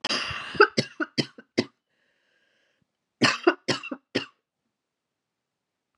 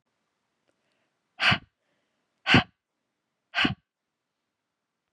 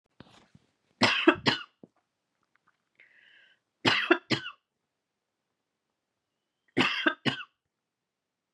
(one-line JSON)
{"cough_length": "6.0 s", "cough_amplitude": 21795, "cough_signal_mean_std_ratio": 0.29, "exhalation_length": "5.1 s", "exhalation_amplitude": 18113, "exhalation_signal_mean_std_ratio": 0.23, "three_cough_length": "8.5 s", "three_cough_amplitude": 18125, "three_cough_signal_mean_std_ratio": 0.28, "survey_phase": "beta (2021-08-13 to 2022-03-07)", "age": "45-64", "gender": "Female", "wearing_mask": "No", "symptom_cough_any": true, "symptom_runny_or_blocked_nose": true, "symptom_sore_throat": true, "symptom_onset": "3 days", "smoker_status": "Never smoked", "respiratory_condition_asthma": false, "respiratory_condition_other": false, "recruitment_source": "Test and Trace", "submission_delay": "1 day", "covid_test_result": "Positive", "covid_test_method": "RT-qPCR", "covid_ct_value": 22.9, "covid_ct_gene": "N gene"}